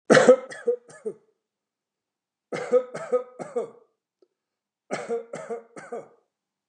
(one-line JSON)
{"three_cough_length": "6.7 s", "three_cough_amplitude": 27151, "three_cough_signal_mean_std_ratio": 0.31, "survey_phase": "beta (2021-08-13 to 2022-03-07)", "age": "45-64", "gender": "Male", "wearing_mask": "No", "symptom_other": true, "symptom_onset": "5 days", "smoker_status": "Never smoked", "respiratory_condition_asthma": false, "respiratory_condition_other": false, "recruitment_source": "REACT", "submission_delay": "3 days", "covid_test_result": "Negative", "covid_test_method": "RT-qPCR", "influenza_a_test_result": "Negative", "influenza_b_test_result": "Negative"}